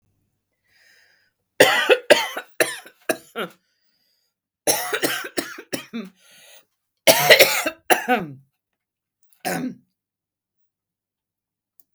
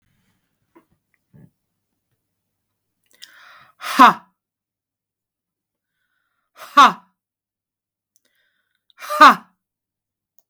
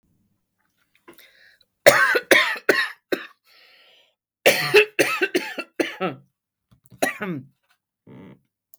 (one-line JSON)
{"three_cough_length": "11.9 s", "three_cough_amplitude": 32768, "three_cough_signal_mean_std_ratio": 0.32, "exhalation_length": "10.5 s", "exhalation_amplitude": 32768, "exhalation_signal_mean_std_ratio": 0.18, "cough_length": "8.8 s", "cough_amplitude": 32768, "cough_signal_mean_std_ratio": 0.35, "survey_phase": "beta (2021-08-13 to 2022-03-07)", "age": "45-64", "gender": "Female", "wearing_mask": "No", "symptom_change_to_sense_of_smell_or_taste": true, "smoker_status": "Never smoked", "respiratory_condition_asthma": false, "respiratory_condition_other": false, "recruitment_source": "Test and Trace", "submission_delay": "1 day", "covid_test_result": "Negative", "covid_test_method": "LFT"}